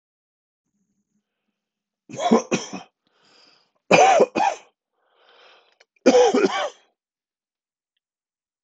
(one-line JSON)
{"three_cough_length": "8.6 s", "three_cough_amplitude": 26021, "three_cough_signal_mean_std_ratio": 0.32, "survey_phase": "beta (2021-08-13 to 2022-03-07)", "age": "65+", "gender": "Male", "wearing_mask": "No", "symptom_none": true, "smoker_status": "Ex-smoker", "respiratory_condition_asthma": false, "respiratory_condition_other": false, "recruitment_source": "REACT", "submission_delay": "1 day", "covid_test_result": "Negative", "covid_test_method": "RT-qPCR", "influenza_a_test_result": "Negative", "influenza_b_test_result": "Negative"}